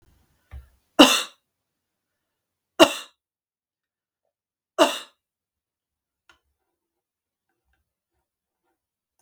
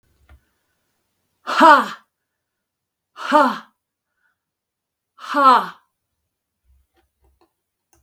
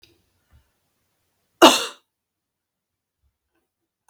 {"three_cough_length": "9.2 s", "three_cough_amplitude": 32768, "three_cough_signal_mean_std_ratio": 0.16, "exhalation_length": "8.0 s", "exhalation_amplitude": 32768, "exhalation_signal_mean_std_ratio": 0.27, "cough_length": "4.1 s", "cough_amplitude": 32768, "cough_signal_mean_std_ratio": 0.16, "survey_phase": "beta (2021-08-13 to 2022-03-07)", "age": "65+", "gender": "Female", "wearing_mask": "No", "symptom_none": true, "smoker_status": "Never smoked", "respiratory_condition_asthma": false, "respiratory_condition_other": false, "recruitment_source": "REACT", "submission_delay": "2 days", "covid_test_result": "Negative", "covid_test_method": "RT-qPCR", "influenza_a_test_result": "Negative", "influenza_b_test_result": "Negative"}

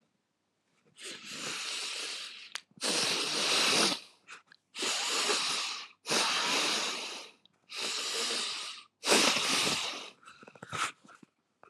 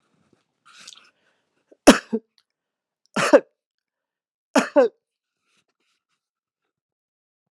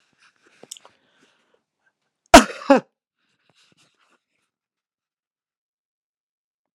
{"exhalation_length": "11.7 s", "exhalation_amplitude": 11678, "exhalation_signal_mean_std_ratio": 0.66, "three_cough_length": "7.5 s", "three_cough_amplitude": 32767, "three_cough_signal_mean_std_ratio": 0.19, "cough_length": "6.7 s", "cough_amplitude": 32768, "cough_signal_mean_std_ratio": 0.13, "survey_phase": "beta (2021-08-13 to 2022-03-07)", "age": "45-64", "gender": "Male", "wearing_mask": "No", "symptom_fever_high_temperature": true, "symptom_headache": true, "symptom_other": true, "symptom_onset": "7 days", "smoker_status": "Never smoked", "respiratory_condition_asthma": false, "respiratory_condition_other": false, "recruitment_source": "Test and Trace", "submission_delay": "5 days", "covid_test_result": "Positive", "covid_test_method": "RT-qPCR", "covid_ct_value": 15.6, "covid_ct_gene": "ORF1ab gene", "covid_ct_mean": 15.8, "covid_viral_load": "6600000 copies/ml", "covid_viral_load_category": "High viral load (>1M copies/ml)"}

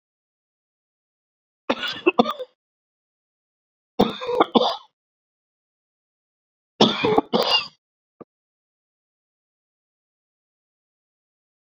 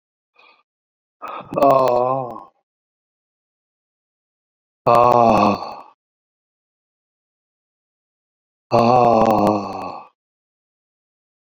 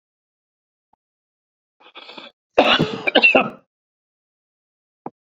{"three_cough_length": "11.7 s", "three_cough_amplitude": 27705, "three_cough_signal_mean_std_ratio": 0.26, "exhalation_length": "11.5 s", "exhalation_amplitude": 30256, "exhalation_signal_mean_std_ratio": 0.37, "cough_length": "5.3 s", "cough_amplitude": 32768, "cough_signal_mean_std_ratio": 0.28, "survey_phase": "beta (2021-08-13 to 2022-03-07)", "age": "65+", "gender": "Male", "wearing_mask": "No", "symptom_runny_or_blocked_nose": true, "smoker_status": "Never smoked", "respiratory_condition_asthma": false, "respiratory_condition_other": false, "recruitment_source": "REACT", "submission_delay": "3 days", "covid_test_result": "Negative", "covid_test_method": "RT-qPCR"}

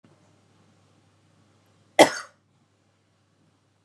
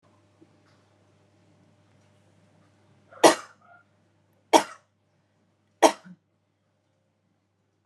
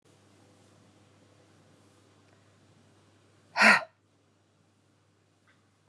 {"cough_length": "3.8 s", "cough_amplitude": 32516, "cough_signal_mean_std_ratio": 0.14, "three_cough_length": "7.9 s", "three_cough_amplitude": 28404, "three_cough_signal_mean_std_ratio": 0.15, "exhalation_length": "5.9 s", "exhalation_amplitude": 18079, "exhalation_signal_mean_std_ratio": 0.18, "survey_phase": "beta (2021-08-13 to 2022-03-07)", "age": "18-44", "gender": "Female", "wearing_mask": "Yes", "symptom_runny_or_blocked_nose": true, "symptom_change_to_sense_of_smell_or_taste": true, "smoker_status": "Never smoked", "respiratory_condition_asthma": false, "respiratory_condition_other": false, "recruitment_source": "Test and Trace", "submission_delay": "2 days", "covid_test_result": "Positive", "covid_test_method": "RT-qPCR", "covid_ct_value": 19.4, "covid_ct_gene": "ORF1ab gene", "covid_ct_mean": 20.1, "covid_viral_load": "250000 copies/ml", "covid_viral_load_category": "Low viral load (10K-1M copies/ml)"}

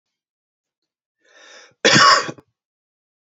{"cough_length": "3.2 s", "cough_amplitude": 30816, "cough_signal_mean_std_ratio": 0.29, "survey_phase": "beta (2021-08-13 to 2022-03-07)", "age": "18-44", "gender": "Male", "wearing_mask": "No", "symptom_cough_any": true, "smoker_status": "Ex-smoker", "respiratory_condition_asthma": false, "respiratory_condition_other": false, "recruitment_source": "Test and Trace", "submission_delay": "2 days", "covid_test_result": "Positive", "covid_test_method": "LFT"}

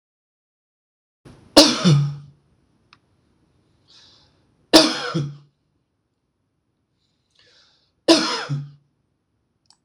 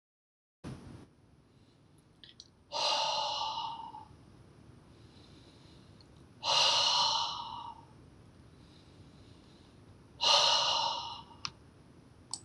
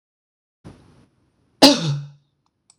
{"three_cough_length": "9.8 s", "three_cough_amplitude": 26028, "three_cough_signal_mean_std_ratio": 0.27, "exhalation_length": "12.4 s", "exhalation_amplitude": 7852, "exhalation_signal_mean_std_ratio": 0.45, "cough_length": "2.8 s", "cough_amplitude": 26028, "cough_signal_mean_std_ratio": 0.25, "survey_phase": "beta (2021-08-13 to 2022-03-07)", "age": "45-64", "gender": "Male", "wearing_mask": "No", "symptom_shortness_of_breath": true, "symptom_sore_throat": true, "symptom_diarrhoea": true, "symptom_headache": true, "symptom_onset": "12 days", "smoker_status": "Ex-smoker", "respiratory_condition_asthma": false, "respiratory_condition_other": false, "recruitment_source": "REACT", "submission_delay": "1 day", "covid_test_result": "Negative", "covid_test_method": "RT-qPCR"}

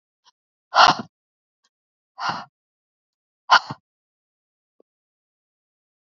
{"exhalation_length": "6.1 s", "exhalation_amplitude": 29421, "exhalation_signal_mean_std_ratio": 0.19, "survey_phase": "beta (2021-08-13 to 2022-03-07)", "age": "65+", "gender": "Female", "wearing_mask": "No", "symptom_none": true, "smoker_status": "Never smoked", "respiratory_condition_asthma": false, "respiratory_condition_other": false, "recruitment_source": "REACT", "submission_delay": "1 day", "covid_test_result": "Negative", "covid_test_method": "RT-qPCR", "influenza_a_test_result": "Negative", "influenza_b_test_result": "Negative"}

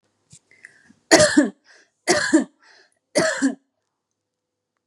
{"three_cough_length": "4.9 s", "three_cough_amplitude": 32767, "three_cough_signal_mean_std_ratio": 0.35, "survey_phase": "beta (2021-08-13 to 2022-03-07)", "age": "18-44", "gender": "Female", "wearing_mask": "No", "symptom_fatigue": true, "symptom_headache": true, "smoker_status": "Never smoked", "respiratory_condition_asthma": false, "respiratory_condition_other": false, "recruitment_source": "REACT", "submission_delay": "1 day", "covid_test_result": "Negative", "covid_test_method": "RT-qPCR", "influenza_a_test_result": "Negative", "influenza_b_test_result": "Negative"}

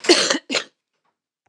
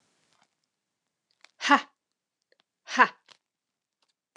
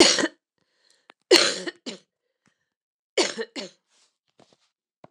{"cough_length": "1.5 s", "cough_amplitude": 29132, "cough_signal_mean_std_ratio": 0.39, "exhalation_length": "4.4 s", "exhalation_amplitude": 21941, "exhalation_signal_mean_std_ratio": 0.18, "three_cough_length": "5.1 s", "three_cough_amplitude": 29204, "three_cough_signal_mean_std_ratio": 0.28, "survey_phase": "beta (2021-08-13 to 2022-03-07)", "age": "45-64", "gender": "Female", "wearing_mask": "No", "symptom_cough_any": true, "symptom_runny_or_blocked_nose": true, "symptom_onset": "12 days", "smoker_status": "Never smoked", "respiratory_condition_asthma": false, "respiratory_condition_other": false, "recruitment_source": "REACT", "submission_delay": "1 day", "covid_test_result": "Negative", "covid_test_method": "RT-qPCR"}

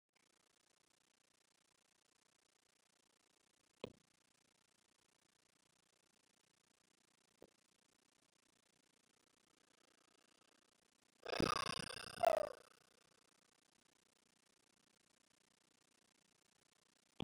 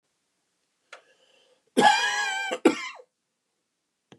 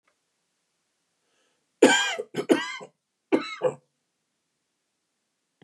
{"exhalation_length": "17.2 s", "exhalation_amplitude": 2379, "exhalation_signal_mean_std_ratio": 0.16, "cough_length": "4.2 s", "cough_amplitude": 18570, "cough_signal_mean_std_ratio": 0.34, "three_cough_length": "5.6 s", "three_cough_amplitude": 25018, "three_cough_signal_mean_std_ratio": 0.27, "survey_phase": "beta (2021-08-13 to 2022-03-07)", "age": "45-64", "gender": "Male", "wearing_mask": "No", "symptom_cough_any": true, "smoker_status": "Ex-smoker", "respiratory_condition_asthma": false, "respiratory_condition_other": false, "recruitment_source": "REACT", "submission_delay": "3 days", "covid_test_result": "Negative", "covid_test_method": "RT-qPCR"}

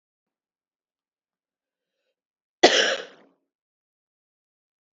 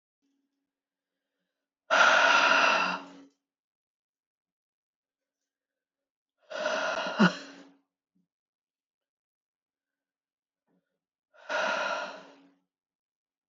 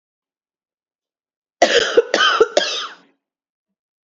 {"cough_length": "4.9 s", "cough_amplitude": 29342, "cough_signal_mean_std_ratio": 0.18, "exhalation_length": "13.5 s", "exhalation_amplitude": 13404, "exhalation_signal_mean_std_ratio": 0.32, "three_cough_length": "4.1 s", "three_cough_amplitude": 29836, "three_cough_signal_mean_std_ratio": 0.36, "survey_phase": "beta (2021-08-13 to 2022-03-07)", "age": "18-44", "gender": "Female", "wearing_mask": "No", "symptom_runny_or_blocked_nose": true, "symptom_shortness_of_breath": true, "symptom_sore_throat": true, "symptom_abdominal_pain": true, "symptom_fatigue": true, "symptom_headache": true, "symptom_onset": "3 days", "smoker_status": "Ex-smoker", "respiratory_condition_asthma": true, "respiratory_condition_other": false, "recruitment_source": "Test and Trace", "submission_delay": "1 day", "covid_test_result": "Positive", "covid_test_method": "ePCR"}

